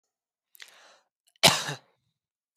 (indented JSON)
{
  "cough_length": "2.6 s",
  "cough_amplitude": 22175,
  "cough_signal_mean_std_ratio": 0.21,
  "survey_phase": "beta (2021-08-13 to 2022-03-07)",
  "age": "18-44",
  "gender": "Male",
  "wearing_mask": "No",
  "symptom_runny_or_blocked_nose": true,
  "smoker_status": "Current smoker (e-cigarettes or vapes only)",
  "respiratory_condition_asthma": false,
  "respiratory_condition_other": false,
  "recruitment_source": "REACT",
  "submission_delay": "1 day",
  "covid_test_result": "Negative",
  "covid_test_method": "RT-qPCR"
}